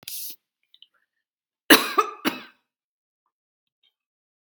{"cough_length": "4.6 s", "cough_amplitude": 32768, "cough_signal_mean_std_ratio": 0.21, "survey_phase": "beta (2021-08-13 to 2022-03-07)", "age": "45-64", "gender": "Female", "wearing_mask": "No", "symptom_none": true, "smoker_status": "Ex-smoker", "respiratory_condition_asthma": false, "respiratory_condition_other": false, "recruitment_source": "REACT", "submission_delay": "0 days", "covid_test_result": "Negative", "covid_test_method": "RT-qPCR"}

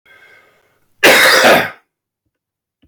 {"cough_length": "2.9 s", "cough_amplitude": 32767, "cough_signal_mean_std_ratio": 0.43, "survey_phase": "beta (2021-08-13 to 2022-03-07)", "age": "65+", "gender": "Male", "wearing_mask": "No", "symptom_cough_any": true, "symptom_runny_or_blocked_nose": true, "symptom_other": true, "symptom_onset": "3 days", "smoker_status": "Ex-smoker", "respiratory_condition_asthma": false, "respiratory_condition_other": false, "recruitment_source": "Test and Trace", "submission_delay": "2 days", "covid_test_result": "Positive", "covid_test_method": "RT-qPCR", "covid_ct_value": 16.9, "covid_ct_gene": "ORF1ab gene"}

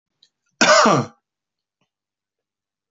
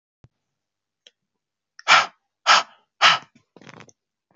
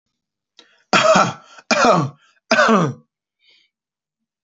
{"cough_length": "2.9 s", "cough_amplitude": 32768, "cough_signal_mean_std_ratio": 0.31, "exhalation_length": "4.4 s", "exhalation_amplitude": 26067, "exhalation_signal_mean_std_ratio": 0.26, "three_cough_length": "4.4 s", "three_cough_amplitude": 27563, "three_cough_signal_mean_std_ratio": 0.43, "survey_phase": "beta (2021-08-13 to 2022-03-07)", "age": "18-44", "gender": "Male", "wearing_mask": "No", "symptom_sore_throat": true, "smoker_status": "Never smoked", "respiratory_condition_asthma": false, "respiratory_condition_other": false, "recruitment_source": "Test and Trace", "submission_delay": "3 days", "covid_test_result": "Positive", "covid_test_method": "LFT"}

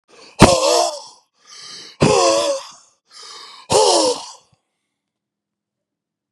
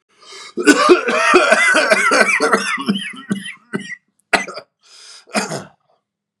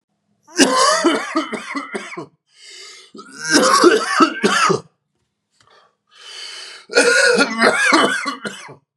{"exhalation_length": "6.3 s", "exhalation_amplitude": 32768, "exhalation_signal_mean_std_ratio": 0.42, "cough_length": "6.4 s", "cough_amplitude": 32768, "cough_signal_mean_std_ratio": 0.57, "three_cough_length": "9.0 s", "three_cough_amplitude": 32768, "three_cough_signal_mean_std_ratio": 0.57, "survey_phase": "beta (2021-08-13 to 2022-03-07)", "age": "18-44", "gender": "Male", "wearing_mask": "No", "symptom_cough_any": true, "symptom_runny_or_blocked_nose": true, "symptom_sore_throat": true, "symptom_fatigue": true, "symptom_headache": true, "smoker_status": "Never smoked", "respiratory_condition_asthma": false, "respiratory_condition_other": false, "recruitment_source": "Test and Trace", "submission_delay": "2 days", "covid_test_result": "Positive", "covid_test_method": "ePCR"}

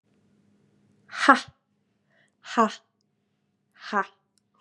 {"exhalation_length": "4.6 s", "exhalation_amplitude": 31500, "exhalation_signal_mean_std_ratio": 0.22, "survey_phase": "beta (2021-08-13 to 2022-03-07)", "age": "18-44", "gender": "Female", "wearing_mask": "No", "symptom_cough_any": true, "symptom_sore_throat": true, "symptom_fatigue": true, "symptom_fever_high_temperature": true, "symptom_headache": true, "smoker_status": "Never smoked", "respiratory_condition_asthma": false, "respiratory_condition_other": false, "recruitment_source": "Test and Trace", "submission_delay": "0 days", "covid_test_result": "Positive", "covid_test_method": "LFT"}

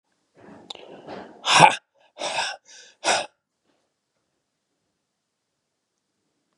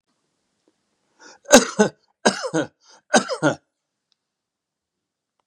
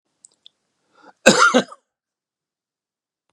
{"exhalation_length": "6.6 s", "exhalation_amplitude": 32762, "exhalation_signal_mean_std_ratio": 0.24, "three_cough_length": "5.5 s", "three_cough_amplitude": 32768, "three_cough_signal_mean_std_ratio": 0.26, "cough_length": "3.3 s", "cough_amplitude": 32768, "cough_signal_mean_std_ratio": 0.25, "survey_phase": "beta (2021-08-13 to 2022-03-07)", "age": "65+", "gender": "Male", "wearing_mask": "No", "symptom_cough_any": true, "symptom_runny_or_blocked_nose": true, "symptom_sore_throat": true, "symptom_onset": "2 days", "smoker_status": "Never smoked", "respiratory_condition_asthma": false, "respiratory_condition_other": false, "recruitment_source": "Test and Trace", "submission_delay": "1 day", "covid_test_result": "Positive", "covid_test_method": "RT-qPCR", "covid_ct_value": 21.6, "covid_ct_gene": "ORF1ab gene", "covid_ct_mean": 21.8, "covid_viral_load": "70000 copies/ml", "covid_viral_load_category": "Low viral load (10K-1M copies/ml)"}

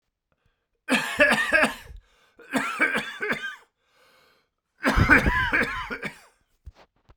{"three_cough_length": "7.2 s", "three_cough_amplitude": 22736, "three_cough_signal_mean_std_ratio": 0.48, "survey_phase": "beta (2021-08-13 to 2022-03-07)", "age": "18-44", "gender": "Male", "wearing_mask": "No", "symptom_cough_any": true, "symptom_fatigue": true, "symptom_fever_high_temperature": true, "symptom_headache": true, "smoker_status": "Never smoked", "respiratory_condition_asthma": false, "respiratory_condition_other": false, "recruitment_source": "Test and Trace", "submission_delay": "2 days", "covid_test_result": "Positive", "covid_test_method": "RT-qPCR", "covid_ct_value": 26.0, "covid_ct_gene": "ORF1ab gene"}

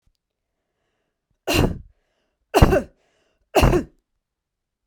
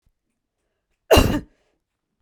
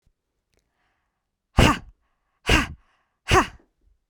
{"three_cough_length": "4.9 s", "three_cough_amplitude": 32767, "three_cough_signal_mean_std_ratio": 0.31, "cough_length": "2.2 s", "cough_amplitude": 32767, "cough_signal_mean_std_ratio": 0.26, "exhalation_length": "4.1 s", "exhalation_amplitude": 26614, "exhalation_signal_mean_std_ratio": 0.28, "survey_phase": "beta (2021-08-13 to 2022-03-07)", "age": "18-44", "gender": "Female", "wearing_mask": "No", "symptom_none": true, "smoker_status": "Never smoked", "respiratory_condition_asthma": false, "respiratory_condition_other": false, "recruitment_source": "REACT", "submission_delay": "1 day", "covid_test_result": "Negative", "covid_test_method": "RT-qPCR", "covid_ct_value": 45.0, "covid_ct_gene": "N gene"}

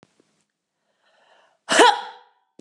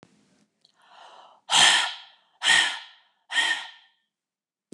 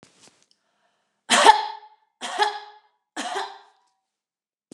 {"cough_length": "2.6 s", "cough_amplitude": 29027, "cough_signal_mean_std_ratio": 0.26, "exhalation_length": "4.7 s", "exhalation_amplitude": 17772, "exhalation_signal_mean_std_ratio": 0.37, "three_cough_length": "4.7 s", "three_cough_amplitude": 29203, "three_cough_signal_mean_std_ratio": 0.28, "survey_phase": "beta (2021-08-13 to 2022-03-07)", "age": "45-64", "gender": "Female", "wearing_mask": "No", "symptom_none": true, "smoker_status": "Never smoked", "respiratory_condition_asthma": false, "respiratory_condition_other": false, "recruitment_source": "Test and Trace", "submission_delay": "1 day", "covid_test_result": "Negative", "covid_test_method": "ePCR"}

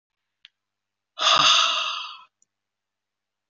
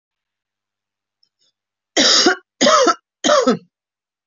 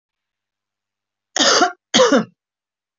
{"exhalation_length": "3.5 s", "exhalation_amplitude": 19347, "exhalation_signal_mean_std_ratio": 0.38, "three_cough_length": "4.3 s", "three_cough_amplitude": 28290, "three_cough_signal_mean_std_ratio": 0.41, "cough_length": "3.0 s", "cough_amplitude": 29763, "cough_signal_mean_std_ratio": 0.37, "survey_phase": "beta (2021-08-13 to 2022-03-07)", "age": "45-64", "gender": "Female", "wearing_mask": "No", "symptom_none": true, "smoker_status": "Never smoked", "respiratory_condition_asthma": false, "respiratory_condition_other": false, "recruitment_source": "REACT", "submission_delay": "2 days", "covid_test_result": "Negative", "covid_test_method": "RT-qPCR"}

